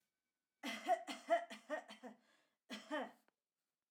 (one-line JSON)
{"cough_length": "3.9 s", "cough_amplitude": 2041, "cough_signal_mean_std_ratio": 0.38, "survey_phase": "alpha (2021-03-01 to 2021-08-12)", "age": "18-44", "gender": "Female", "wearing_mask": "No", "symptom_none": true, "smoker_status": "Never smoked", "respiratory_condition_asthma": false, "respiratory_condition_other": false, "recruitment_source": "REACT", "submission_delay": "1 day", "covid_test_result": "Negative", "covid_test_method": "RT-qPCR"}